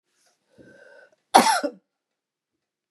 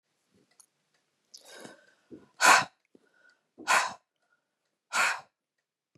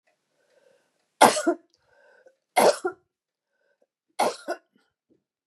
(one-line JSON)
{"cough_length": "2.9 s", "cough_amplitude": 32753, "cough_signal_mean_std_ratio": 0.24, "exhalation_length": "6.0 s", "exhalation_amplitude": 16944, "exhalation_signal_mean_std_ratio": 0.26, "three_cough_length": "5.5 s", "three_cough_amplitude": 31589, "three_cough_signal_mean_std_ratio": 0.26, "survey_phase": "beta (2021-08-13 to 2022-03-07)", "age": "65+", "gender": "Female", "wearing_mask": "No", "symptom_none": true, "smoker_status": "Ex-smoker", "respiratory_condition_asthma": false, "respiratory_condition_other": false, "recruitment_source": "REACT", "submission_delay": "2 days", "covid_test_result": "Negative", "covid_test_method": "RT-qPCR", "influenza_a_test_result": "Negative", "influenza_b_test_result": "Negative"}